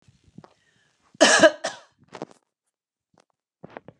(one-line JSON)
{"cough_length": "4.0 s", "cough_amplitude": 31762, "cough_signal_mean_std_ratio": 0.23, "survey_phase": "alpha (2021-03-01 to 2021-08-12)", "age": "45-64", "gender": "Female", "wearing_mask": "No", "symptom_none": true, "smoker_status": "Ex-smoker", "respiratory_condition_asthma": false, "respiratory_condition_other": false, "recruitment_source": "REACT", "submission_delay": "6 days", "covid_test_result": "Negative", "covid_test_method": "RT-qPCR"}